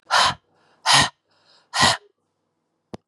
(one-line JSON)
{"exhalation_length": "3.1 s", "exhalation_amplitude": 26597, "exhalation_signal_mean_std_ratio": 0.38, "survey_phase": "beta (2021-08-13 to 2022-03-07)", "age": "45-64", "gender": "Female", "wearing_mask": "No", "symptom_cough_any": true, "symptom_runny_or_blocked_nose": true, "symptom_diarrhoea": true, "symptom_fatigue": true, "symptom_headache": true, "symptom_change_to_sense_of_smell_or_taste": true, "symptom_onset": "4 days", "smoker_status": "Ex-smoker", "respiratory_condition_asthma": false, "respiratory_condition_other": false, "recruitment_source": "Test and Trace", "submission_delay": "2 days", "covid_test_result": "Positive", "covid_test_method": "RT-qPCR", "covid_ct_value": 16.6, "covid_ct_gene": "ORF1ab gene", "covid_ct_mean": 17.7, "covid_viral_load": "1500000 copies/ml", "covid_viral_load_category": "High viral load (>1M copies/ml)"}